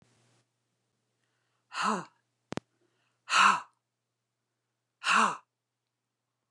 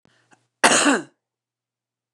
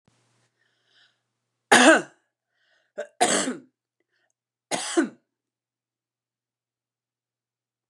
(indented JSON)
{
  "exhalation_length": "6.5 s",
  "exhalation_amplitude": 11161,
  "exhalation_signal_mean_std_ratio": 0.27,
  "cough_length": "2.1 s",
  "cough_amplitude": 29204,
  "cough_signal_mean_std_ratio": 0.32,
  "three_cough_length": "7.9 s",
  "three_cough_amplitude": 29203,
  "three_cough_signal_mean_std_ratio": 0.24,
  "survey_phase": "beta (2021-08-13 to 2022-03-07)",
  "age": "45-64",
  "gender": "Female",
  "wearing_mask": "No",
  "symptom_none": true,
  "smoker_status": "Never smoked",
  "respiratory_condition_asthma": false,
  "respiratory_condition_other": false,
  "recruitment_source": "REACT",
  "submission_delay": "2 days",
  "covid_test_result": "Negative",
  "covid_test_method": "RT-qPCR"
}